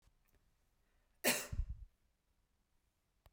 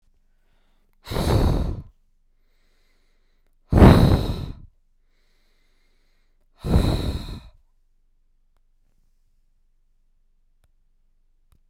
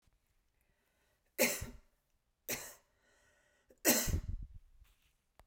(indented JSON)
{
  "cough_length": "3.3 s",
  "cough_amplitude": 3374,
  "cough_signal_mean_std_ratio": 0.27,
  "exhalation_length": "11.7 s",
  "exhalation_amplitude": 32768,
  "exhalation_signal_mean_std_ratio": 0.29,
  "three_cough_length": "5.5 s",
  "three_cough_amplitude": 6724,
  "three_cough_signal_mean_std_ratio": 0.31,
  "survey_phase": "beta (2021-08-13 to 2022-03-07)",
  "age": "45-64",
  "gender": "Female",
  "wearing_mask": "No",
  "symptom_none": true,
  "smoker_status": "Never smoked",
  "respiratory_condition_asthma": false,
  "respiratory_condition_other": false,
  "recruitment_source": "REACT",
  "submission_delay": "1 day",
  "covid_test_result": "Negative",
  "covid_test_method": "RT-qPCR"
}